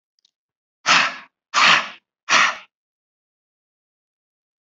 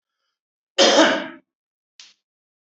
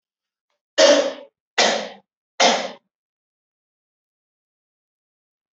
{"exhalation_length": "4.7 s", "exhalation_amplitude": 28772, "exhalation_signal_mean_std_ratio": 0.33, "cough_length": "2.6 s", "cough_amplitude": 28060, "cough_signal_mean_std_ratio": 0.33, "three_cough_length": "5.5 s", "three_cough_amplitude": 26412, "three_cough_signal_mean_std_ratio": 0.3, "survey_phase": "beta (2021-08-13 to 2022-03-07)", "age": "45-64", "gender": "Male", "wearing_mask": "No", "symptom_none": true, "smoker_status": "Ex-smoker", "respiratory_condition_asthma": false, "respiratory_condition_other": false, "recruitment_source": "REACT", "submission_delay": "1 day", "covid_test_result": "Negative", "covid_test_method": "RT-qPCR"}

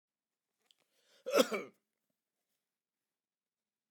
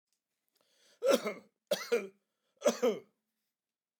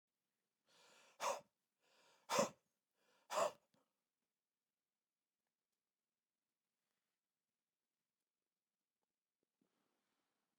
{"cough_length": "3.9 s", "cough_amplitude": 7067, "cough_signal_mean_std_ratio": 0.19, "three_cough_length": "4.0 s", "three_cough_amplitude": 7168, "three_cough_signal_mean_std_ratio": 0.34, "exhalation_length": "10.6 s", "exhalation_amplitude": 1962, "exhalation_signal_mean_std_ratio": 0.18, "survey_phase": "beta (2021-08-13 to 2022-03-07)", "age": "65+", "gender": "Male", "wearing_mask": "No", "symptom_sore_throat": true, "smoker_status": "Never smoked", "respiratory_condition_asthma": false, "respiratory_condition_other": false, "recruitment_source": "REACT", "submission_delay": "3 days", "covid_test_result": "Negative", "covid_test_method": "RT-qPCR", "influenza_a_test_result": "Negative", "influenza_b_test_result": "Negative"}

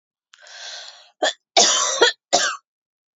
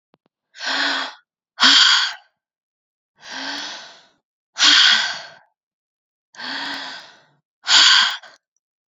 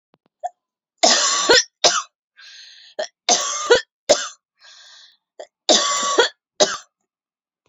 {"cough_length": "3.2 s", "cough_amplitude": 29827, "cough_signal_mean_std_ratio": 0.43, "exhalation_length": "8.9 s", "exhalation_amplitude": 32767, "exhalation_signal_mean_std_ratio": 0.41, "three_cough_length": "7.7 s", "three_cough_amplitude": 32767, "three_cough_signal_mean_std_ratio": 0.41, "survey_phase": "beta (2021-08-13 to 2022-03-07)", "age": "18-44", "gender": "Female", "wearing_mask": "No", "symptom_runny_or_blocked_nose": true, "symptom_sore_throat": true, "symptom_headache": true, "symptom_other": true, "smoker_status": "Never smoked", "respiratory_condition_asthma": false, "respiratory_condition_other": false, "recruitment_source": "Test and Trace", "submission_delay": "3 days", "covid_test_result": "Positive", "covid_test_method": "RT-qPCR", "covid_ct_value": 26.7, "covid_ct_gene": "S gene"}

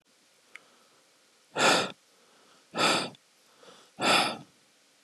{"exhalation_length": "5.0 s", "exhalation_amplitude": 11326, "exhalation_signal_mean_std_ratio": 0.37, "survey_phase": "beta (2021-08-13 to 2022-03-07)", "age": "18-44", "gender": "Male", "wearing_mask": "No", "symptom_runny_or_blocked_nose": true, "symptom_change_to_sense_of_smell_or_taste": true, "symptom_onset": "11 days", "smoker_status": "Never smoked", "respiratory_condition_asthma": false, "respiratory_condition_other": false, "recruitment_source": "REACT", "submission_delay": "1 day", "covid_test_result": "Negative", "covid_test_method": "RT-qPCR", "influenza_a_test_result": "Negative", "influenza_b_test_result": "Negative"}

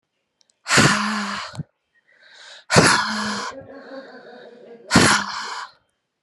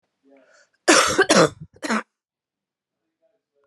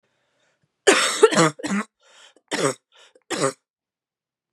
{"exhalation_length": "6.2 s", "exhalation_amplitude": 32516, "exhalation_signal_mean_std_ratio": 0.46, "cough_length": "3.7 s", "cough_amplitude": 29358, "cough_signal_mean_std_ratio": 0.33, "three_cough_length": "4.5 s", "three_cough_amplitude": 29043, "three_cough_signal_mean_std_ratio": 0.36, "survey_phase": "beta (2021-08-13 to 2022-03-07)", "age": "18-44", "gender": "Female", "wearing_mask": "No", "symptom_new_continuous_cough": true, "symptom_runny_or_blocked_nose": true, "symptom_shortness_of_breath": true, "symptom_sore_throat": true, "symptom_fatigue": true, "symptom_headache": true, "symptom_change_to_sense_of_smell_or_taste": true, "symptom_onset": "5 days", "smoker_status": "Never smoked", "respiratory_condition_asthma": true, "respiratory_condition_other": false, "recruitment_source": "Test and Trace", "submission_delay": "2 days", "covid_test_result": "Positive", "covid_test_method": "ePCR"}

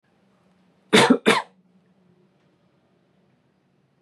{"cough_length": "4.0 s", "cough_amplitude": 28137, "cough_signal_mean_std_ratio": 0.24, "survey_phase": "beta (2021-08-13 to 2022-03-07)", "age": "18-44", "gender": "Male", "wearing_mask": "No", "symptom_none": true, "smoker_status": "Never smoked", "respiratory_condition_asthma": false, "respiratory_condition_other": false, "recruitment_source": "REACT", "submission_delay": "1 day", "covid_test_result": "Negative", "covid_test_method": "RT-qPCR"}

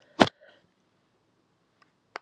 {"three_cough_length": "2.2 s", "three_cough_amplitude": 26842, "three_cough_signal_mean_std_ratio": 0.12, "survey_phase": "beta (2021-08-13 to 2022-03-07)", "age": "18-44", "gender": "Female", "wearing_mask": "No", "symptom_cough_any": true, "symptom_new_continuous_cough": true, "symptom_runny_or_blocked_nose": true, "symptom_sore_throat": true, "symptom_fatigue": true, "symptom_fever_high_temperature": true, "symptom_change_to_sense_of_smell_or_taste": true, "symptom_loss_of_taste": true, "symptom_onset": "3 days", "smoker_status": "Never smoked", "respiratory_condition_asthma": false, "respiratory_condition_other": false, "recruitment_source": "Test and Trace", "submission_delay": "2 days", "covid_test_result": "Positive", "covid_test_method": "RT-qPCR", "covid_ct_value": 19.7, "covid_ct_gene": "N gene", "covid_ct_mean": 20.3, "covid_viral_load": "220000 copies/ml", "covid_viral_load_category": "Low viral load (10K-1M copies/ml)"}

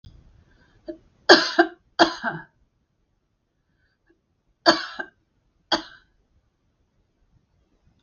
{"cough_length": "8.0 s", "cough_amplitude": 32768, "cough_signal_mean_std_ratio": 0.22, "survey_phase": "beta (2021-08-13 to 2022-03-07)", "age": "65+", "gender": "Female", "wearing_mask": "No", "symptom_none": true, "smoker_status": "Never smoked", "respiratory_condition_asthma": false, "respiratory_condition_other": false, "recruitment_source": "REACT", "submission_delay": "3 days", "covid_test_result": "Negative", "covid_test_method": "RT-qPCR", "influenza_a_test_result": "Negative", "influenza_b_test_result": "Negative"}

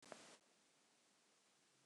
{"three_cough_length": "1.9 s", "three_cough_amplitude": 441, "three_cough_signal_mean_std_ratio": 0.53, "survey_phase": "beta (2021-08-13 to 2022-03-07)", "age": "45-64", "gender": "Female", "wearing_mask": "No", "symptom_none": true, "smoker_status": "Never smoked", "respiratory_condition_asthma": false, "respiratory_condition_other": false, "recruitment_source": "REACT", "submission_delay": "1 day", "covid_test_result": "Negative", "covid_test_method": "RT-qPCR"}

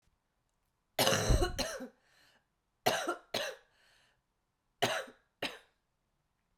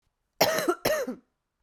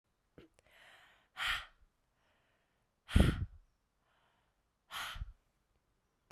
{"three_cough_length": "6.6 s", "three_cough_amplitude": 8767, "three_cough_signal_mean_std_ratio": 0.37, "cough_length": "1.6 s", "cough_amplitude": 15183, "cough_signal_mean_std_ratio": 0.5, "exhalation_length": "6.3 s", "exhalation_amplitude": 7189, "exhalation_signal_mean_std_ratio": 0.24, "survey_phase": "beta (2021-08-13 to 2022-03-07)", "age": "18-44", "gender": "Female", "wearing_mask": "No", "symptom_cough_any": true, "symptom_shortness_of_breath": true, "symptom_other": true, "smoker_status": "Never smoked", "respiratory_condition_asthma": false, "respiratory_condition_other": false, "recruitment_source": "Test and Trace", "submission_delay": "2 days", "covid_test_result": "Positive", "covid_test_method": "RT-qPCR", "covid_ct_value": 23.9, "covid_ct_gene": "ORF1ab gene", "covid_ct_mean": 24.6, "covid_viral_load": "8800 copies/ml", "covid_viral_load_category": "Minimal viral load (< 10K copies/ml)"}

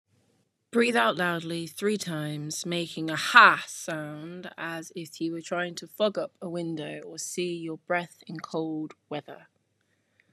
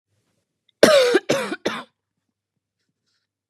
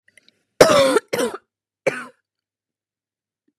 {"exhalation_length": "10.3 s", "exhalation_amplitude": 30621, "exhalation_signal_mean_std_ratio": 0.49, "cough_length": "3.5 s", "cough_amplitude": 32768, "cough_signal_mean_std_ratio": 0.33, "three_cough_length": "3.6 s", "three_cough_amplitude": 32768, "three_cough_signal_mean_std_ratio": 0.32, "survey_phase": "beta (2021-08-13 to 2022-03-07)", "age": "18-44", "gender": "Female", "wearing_mask": "No", "symptom_cough_any": true, "symptom_runny_or_blocked_nose": true, "symptom_sore_throat": true, "symptom_headache": true, "symptom_change_to_sense_of_smell_or_taste": true, "symptom_loss_of_taste": true, "symptom_onset": "4 days", "smoker_status": "Never smoked", "respiratory_condition_asthma": false, "respiratory_condition_other": false, "recruitment_source": "REACT", "submission_delay": "1 day", "covid_test_result": "Positive", "covid_test_method": "RT-qPCR", "covid_ct_value": 21.0, "covid_ct_gene": "E gene", "influenza_a_test_result": "Negative", "influenza_b_test_result": "Negative"}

